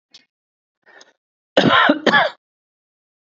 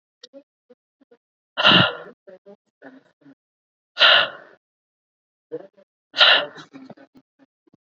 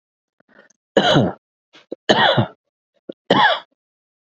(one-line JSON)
{"cough_length": "3.2 s", "cough_amplitude": 28984, "cough_signal_mean_std_ratio": 0.36, "exhalation_length": "7.9 s", "exhalation_amplitude": 30045, "exhalation_signal_mean_std_ratio": 0.28, "three_cough_length": "4.3 s", "three_cough_amplitude": 30284, "three_cough_signal_mean_std_ratio": 0.39, "survey_phase": "beta (2021-08-13 to 2022-03-07)", "age": "18-44", "gender": "Male", "wearing_mask": "No", "symptom_headache": true, "symptom_onset": "6 days", "smoker_status": "Ex-smoker", "respiratory_condition_asthma": false, "respiratory_condition_other": false, "recruitment_source": "REACT", "submission_delay": "1 day", "covid_test_result": "Negative", "covid_test_method": "RT-qPCR", "influenza_a_test_result": "Unknown/Void", "influenza_b_test_result": "Unknown/Void"}